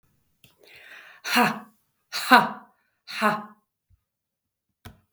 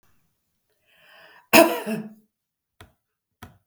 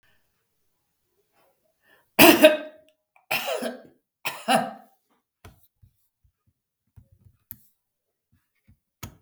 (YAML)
exhalation_length: 5.1 s
exhalation_amplitude: 32766
exhalation_signal_mean_std_ratio: 0.29
cough_length: 3.7 s
cough_amplitude: 32766
cough_signal_mean_std_ratio: 0.22
three_cough_length: 9.2 s
three_cough_amplitude: 32768
three_cough_signal_mean_std_ratio: 0.22
survey_phase: beta (2021-08-13 to 2022-03-07)
age: 65+
gender: Female
wearing_mask: 'No'
symptom_none: true
smoker_status: Never smoked
respiratory_condition_asthma: true
respiratory_condition_other: false
recruitment_source: REACT
submission_delay: 0 days
covid_test_result: Negative
covid_test_method: RT-qPCR
influenza_a_test_result: Negative
influenza_b_test_result: Negative